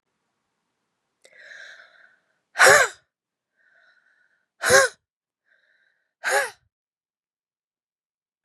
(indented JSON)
{
  "exhalation_length": "8.4 s",
  "exhalation_amplitude": 30122,
  "exhalation_signal_mean_std_ratio": 0.23,
  "survey_phase": "beta (2021-08-13 to 2022-03-07)",
  "age": "45-64",
  "gender": "Female",
  "wearing_mask": "No",
  "symptom_cough_any": true,
  "symptom_runny_or_blocked_nose": true,
  "symptom_shortness_of_breath": true,
  "symptom_fatigue": true,
  "symptom_fever_high_temperature": true,
  "symptom_headache": true,
  "symptom_change_to_sense_of_smell_or_taste": true,
  "symptom_loss_of_taste": true,
  "symptom_onset": "5 days",
  "smoker_status": "Never smoked",
  "respiratory_condition_asthma": false,
  "respiratory_condition_other": false,
  "recruitment_source": "Test and Trace",
  "submission_delay": "1 day",
  "covid_test_result": "Positive",
  "covid_test_method": "ePCR"
}